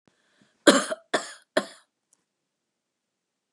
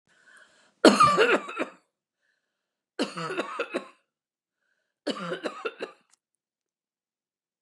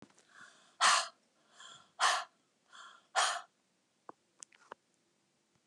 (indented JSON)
{
  "cough_length": "3.5 s",
  "cough_amplitude": 27775,
  "cough_signal_mean_std_ratio": 0.22,
  "three_cough_length": "7.6 s",
  "three_cough_amplitude": 26862,
  "three_cough_signal_mean_std_ratio": 0.31,
  "exhalation_length": "5.7 s",
  "exhalation_amplitude": 6789,
  "exhalation_signal_mean_std_ratio": 0.3,
  "survey_phase": "beta (2021-08-13 to 2022-03-07)",
  "age": "65+",
  "gender": "Female",
  "wearing_mask": "No",
  "symptom_none": true,
  "smoker_status": "Never smoked",
  "respiratory_condition_asthma": false,
  "respiratory_condition_other": false,
  "recruitment_source": "REACT",
  "submission_delay": "1 day",
  "covid_test_result": "Negative",
  "covid_test_method": "RT-qPCR",
  "influenza_a_test_result": "Negative",
  "influenza_b_test_result": "Negative"
}